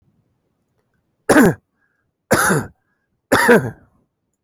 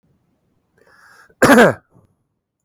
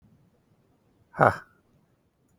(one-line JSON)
{"three_cough_length": "4.4 s", "three_cough_amplitude": 32019, "three_cough_signal_mean_std_ratio": 0.36, "cough_length": "2.6 s", "cough_amplitude": 31740, "cough_signal_mean_std_ratio": 0.29, "exhalation_length": "2.4 s", "exhalation_amplitude": 27382, "exhalation_signal_mean_std_ratio": 0.18, "survey_phase": "beta (2021-08-13 to 2022-03-07)", "age": "45-64", "gender": "Male", "wearing_mask": "No", "symptom_none": true, "smoker_status": "Never smoked", "respiratory_condition_asthma": false, "respiratory_condition_other": false, "recruitment_source": "REACT", "submission_delay": "1 day", "covid_test_result": "Negative", "covid_test_method": "RT-qPCR"}